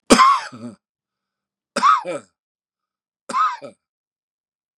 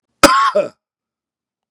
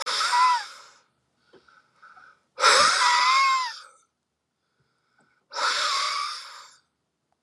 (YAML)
three_cough_length: 4.8 s
three_cough_amplitude: 32768
three_cough_signal_mean_std_ratio: 0.34
cough_length: 1.7 s
cough_amplitude: 32768
cough_signal_mean_std_ratio: 0.38
exhalation_length: 7.4 s
exhalation_amplitude: 17555
exhalation_signal_mean_std_ratio: 0.5
survey_phase: beta (2021-08-13 to 2022-03-07)
age: 65+
gender: Male
wearing_mask: 'No'
symptom_none: true
smoker_status: Never smoked
respiratory_condition_asthma: true
respiratory_condition_other: true
recruitment_source: REACT
submission_delay: 1 day
covid_test_result: Negative
covid_test_method: RT-qPCR
influenza_a_test_result: Negative
influenza_b_test_result: Negative